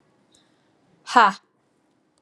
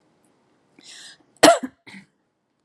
exhalation_length: 2.2 s
exhalation_amplitude: 32678
exhalation_signal_mean_std_ratio: 0.22
cough_length: 2.6 s
cough_amplitude: 32767
cough_signal_mean_std_ratio: 0.21
survey_phase: alpha (2021-03-01 to 2021-08-12)
age: 45-64
gender: Female
wearing_mask: 'No'
symptom_none: true
smoker_status: Never smoked
respiratory_condition_asthma: false
respiratory_condition_other: false
recruitment_source: Test and Trace
submission_delay: 0 days
covid_test_result: Negative
covid_test_method: LFT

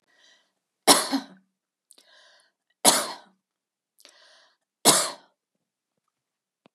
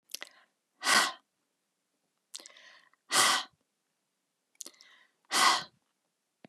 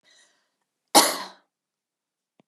three_cough_length: 6.7 s
three_cough_amplitude: 29388
three_cough_signal_mean_std_ratio: 0.24
exhalation_length: 6.5 s
exhalation_amplitude: 11554
exhalation_signal_mean_std_ratio: 0.3
cough_length: 2.5 s
cough_amplitude: 31259
cough_signal_mean_std_ratio: 0.21
survey_phase: beta (2021-08-13 to 2022-03-07)
age: 45-64
gender: Female
wearing_mask: 'No'
symptom_none: true
smoker_status: Never smoked
respiratory_condition_asthma: false
respiratory_condition_other: false
recruitment_source: REACT
submission_delay: 1 day
covid_test_result: Negative
covid_test_method: RT-qPCR
influenza_a_test_result: Unknown/Void
influenza_b_test_result: Unknown/Void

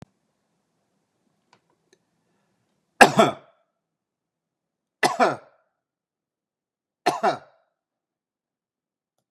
three_cough_length: 9.3 s
three_cough_amplitude: 32768
three_cough_signal_mean_std_ratio: 0.19
survey_phase: beta (2021-08-13 to 2022-03-07)
age: 45-64
gender: Male
wearing_mask: 'No'
symptom_none: true
smoker_status: Never smoked
respiratory_condition_asthma: false
respiratory_condition_other: false
recruitment_source: REACT
submission_delay: 1 day
covid_test_result: Negative
covid_test_method: RT-qPCR
influenza_a_test_result: Negative
influenza_b_test_result: Negative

